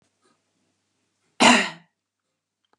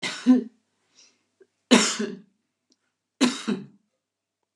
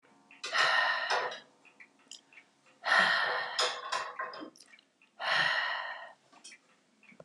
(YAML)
cough_length: 2.8 s
cough_amplitude: 31238
cough_signal_mean_std_ratio: 0.24
three_cough_length: 4.6 s
three_cough_amplitude: 28528
three_cough_signal_mean_std_ratio: 0.33
exhalation_length: 7.2 s
exhalation_amplitude: 7493
exhalation_signal_mean_std_ratio: 0.54
survey_phase: beta (2021-08-13 to 2022-03-07)
age: 65+
gender: Female
wearing_mask: 'No'
symptom_none: true
smoker_status: Never smoked
respiratory_condition_asthma: false
respiratory_condition_other: false
recruitment_source: REACT
submission_delay: 1 day
covid_test_result: Negative
covid_test_method: RT-qPCR
influenza_a_test_result: Negative
influenza_b_test_result: Negative